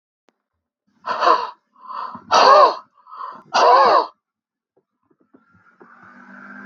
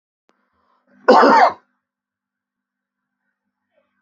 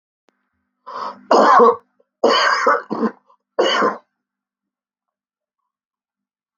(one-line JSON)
{"exhalation_length": "6.7 s", "exhalation_amplitude": 32768, "exhalation_signal_mean_std_ratio": 0.38, "cough_length": "4.0 s", "cough_amplitude": 32768, "cough_signal_mean_std_ratio": 0.27, "three_cough_length": "6.6 s", "three_cough_amplitude": 32768, "three_cough_signal_mean_std_ratio": 0.4, "survey_phase": "beta (2021-08-13 to 2022-03-07)", "age": "65+", "gender": "Male", "wearing_mask": "No", "symptom_none": true, "smoker_status": "Ex-smoker", "respiratory_condition_asthma": false, "respiratory_condition_other": false, "recruitment_source": "REACT", "submission_delay": "2 days", "covid_test_result": "Negative", "covid_test_method": "RT-qPCR", "influenza_a_test_result": "Unknown/Void", "influenza_b_test_result": "Unknown/Void"}